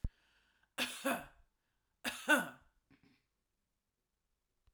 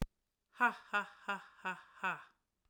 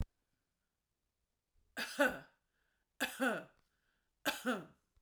cough_length: 4.7 s
cough_amplitude: 5146
cough_signal_mean_std_ratio: 0.28
exhalation_length: 2.7 s
exhalation_amplitude: 3765
exhalation_signal_mean_std_ratio: 0.38
three_cough_length: 5.0 s
three_cough_amplitude: 3117
three_cough_signal_mean_std_ratio: 0.34
survey_phase: alpha (2021-03-01 to 2021-08-12)
age: 45-64
gender: Female
wearing_mask: 'No'
symptom_none: true
smoker_status: Ex-smoker
respiratory_condition_asthma: false
respiratory_condition_other: false
recruitment_source: REACT
submission_delay: 1 day
covid_test_result: Negative
covid_test_method: RT-qPCR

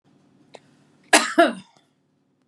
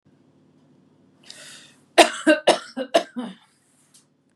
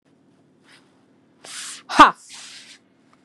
cough_length: 2.5 s
cough_amplitude: 32767
cough_signal_mean_std_ratio: 0.27
three_cough_length: 4.4 s
three_cough_amplitude: 32767
three_cough_signal_mean_std_ratio: 0.27
exhalation_length: 3.2 s
exhalation_amplitude: 32768
exhalation_signal_mean_std_ratio: 0.2
survey_phase: beta (2021-08-13 to 2022-03-07)
age: 45-64
gender: Female
wearing_mask: 'No'
symptom_none: true
smoker_status: Ex-smoker
respiratory_condition_asthma: true
respiratory_condition_other: false
recruitment_source: REACT
submission_delay: 2 days
covid_test_result: Negative
covid_test_method: RT-qPCR
influenza_a_test_result: Negative
influenza_b_test_result: Negative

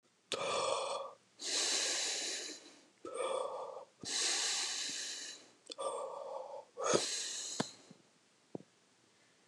exhalation_length: 9.5 s
exhalation_amplitude: 5820
exhalation_signal_mean_std_ratio: 0.69
survey_phase: alpha (2021-03-01 to 2021-08-12)
age: 65+
gender: Male
wearing_mask: 'No'
symptom_none: true
smoker_status: Ex-smoker
respiratory_condition_asthma: false
respiratory_condition_other: false
recruitment_source: REACT
submission_delay: 2 days
covid_test_result: Negative
covid_test_method: RT-qPCR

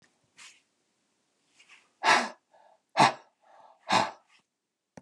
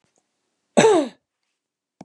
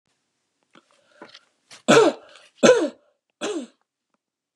exhalation_length: 5.0 s
exhalation_amplitude: 13734
exhalation_signal_mean_std_ratio: 0.27
cough_length: 2.0 s
cough_amplitude: 30519
cough_signal_mean_std_ratio: 0.31
three_cough_length: 4.6 s
three_cough_amplitude: 28606
three_cough_signal_mean_std_ratio: 0.29
survey_phase: beta (2021-08-13 to 2022-03-07)
age: 65+
gender: Male
wearing_mask: 'No'
symptom_none: true
symptom_onset: 8 days
smoker_status: Ex-smoker
respiratory_condition_asthma: false
respiratory_condition_other: false
recruitment_source: REACT
submission_delay: 1 day
covid_test_result: Positive
covid_test_method: RT-qPCR
covid_ct_value: 37.0
covid_ct_gene: N gene
influenza_a_test_result: Negative
influenza_b_test_result: Negative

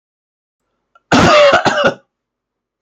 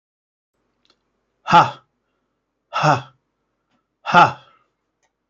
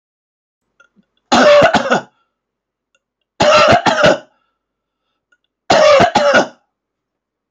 cough_length: 2.8 s
cough_amplitude: 29955
cough_signal_mean_std_ratio: 0.46
exhalation_length: 5.3 s
exhalation_amplitude: 30023
exhalation_signal_mean_std_ratio: 0.26
three_cough_length: 7.5 s
three_cough_amplitude: 30680
three_cough_signal_mean_std_ratio: 0.46
survey_phase: beta (2021-08-13 to 2022-03-07)
age: 65+
gender: Male
wearing_mask: 'No'
symptom_none: true
smoker_status: Ex-smoker
respiratory_condition_asthma: false
respiratory_condition_other: false
recruitment_source: REACT
submission_delay: 4 days
covid_test_result: Negative
covid_test_method: RT-qPCR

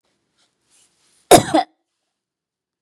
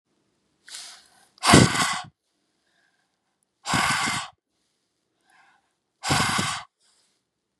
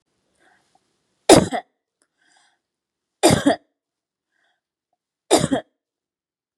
cough_length: 2.8 s
cough_amplitude: 32768
cough_signal_mean_std_ratio: 0.21
exhalation_length: 7.6 s
exhalation_amplitude: 30260
exhalation_signal_mean_std_ratio: 0.33
three_cough_length: 6.6 s
three_cough_amplitude: 32768
three_cough_signal_mean_std_ratio: 0.24
survey_phase: beta (2021-08-13 to 2022-03-07)
age: 45-64
gender: Female
wearing_mask: 'No'
symptom_none: true
smoker_status: Never smoked
respiratory_condition_asthma: false
respiratory_condition_other: false
recruitment_source: REACT
submission_delay: 2 days
covid_test_result: Negative
covid_test_method: RT-qPCR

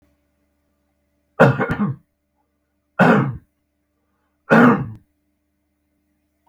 three_cough_length: 6.5 s
three_cough_amplitude: 32768
three_cough_signal_mean_std_ratio: 0.32
survey_phase: beta (2021-08-13 to 2022-03-07)
age: 45-64
gender: Male
wearing_mask: 'No'
symptom_none: true
smoker_status: Never smoked
respiratory_condition_asthma: false
respiratory_condition_other: false
recruitment_source: REACT
submission_delay: 2 days
covid_test_result: Negative
covid_test_method: RT-qPCR
influenza_a_test_result: Negative
influenza_b_test_result: Negative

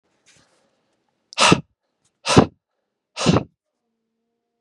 exhalation_length: 4.6 s
exhalation_amplitude: 32768
exhalation_signal_mean_std_ratio: 0.26
survey_phase: beta (2021-08-13 to 2022-03-07)
age: 18-44
gender: Male
wearing_mask: 'No'
symptom_cough_any: true
symptom_new_continuous_cough: true
symptom_runny_or_blocked_nose: true
symptom_other: true
symptom_onset: 3 days
smoker_status: Never smoked
respiratory_condition_asthma: false
respiratory_condition_other: false
recruitment_source: Test and Trace
submission_delay: 2 days
covid_test_result: Positive
covid_test_method: RT-qPCR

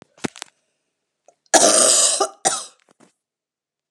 cough_length: 3.9 s
cough_amplitude: 32767
cough_signal_mean_std_ratio: 0.38
survey_phase: alpha (2021-03-01 to 2021-08-12)
age: 45-64
gender: Female
wearing_mask: 'No'
symptom_loss_of_taste: true
smoker_status: Never smoked
respiratory_condition_asthma: false
respiratory_condition_other: false
recruitment_source: Test and Trace
submission_delay: 1 day
covid_test_result: Positive
covid_test_method: RT-qPCR
covid_ct_value: 19.8
covid_ct_gene: ORF1ab gene
covid_ct_mean: 20.6
covid_viral_load: 170000 copies/ml
covid_viral_load_category: Low viral load (10K-1M copies/ml)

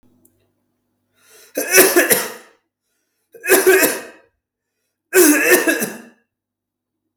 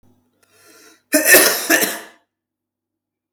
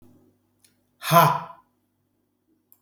three_cough_length: 7.2 s
three_cough_amplitude: 32768
three_cough_signal_mean_std_ratio: 0.41
cough_length: 3.3 s
cough_amplitude: 32768
cough_signal_mean_std_ratio: 0.36
exhalation_length: 2.8 s
exhalation_amplitude: 27354
exhalation_signal_mean_std_ratio: 0.27
survey_phase: beta (2021-08-13 to 2022-03-07)
age: 18-44
gender: Male
wearing_mask: 'No'
symptom_cough_any: true
symptom_runny_or_blocked_nose: true
symptom_onset: 10 days
smoker_status: Never smoked
respiratory_condition_asthma: true
respiratory_condition_other: false
recruitment_source: REACT
submission_delay: 2 days
covid_test_result: Negative
covid_test_method: RT-qPCR
influenza_a_test_result: Negative
influenza_b_test_result: Negative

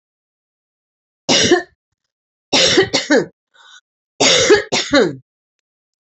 three_cough_length: 6.1 s
three_cough_amplitude: 32768
three_cough_signal_mean_std_ratio: 0.43
survey_phase: beta (2021-08-13 to 2022-03-07)
age: 45-64
gender: Female
wearing_mask: 'No'
symptom_none: true
smoker_status: Never smoked
respiratory_condition_asthma: false
respiratory_condition_other: false
recruitment_source: Test and Trace
submission_delay: 1 day
covid_test_result: Negative
covid_test_method: RT-qPCR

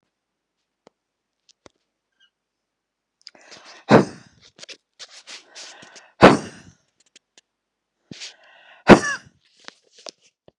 exhalation_length: 10.6 s
exhalation_amplitude: 32768
exhalation_signal_mean_std_ratio: 0.17
survey_phase: beta (2021-08-13 to 2022-03-07)
age: 65+
gender: Female
wearing_mask: 'No'
symptom_none: true
smoker_status: Never smoked
respiratory_condition_asthma: false
respiratory_condition_other: false
recruitment_source: REACT
submission_delay: 1 day
covid_test_result: Negative
covid_test_method: RT-qPCR
influenza_a_test_result: Negative
influenza_b_test_result: Negative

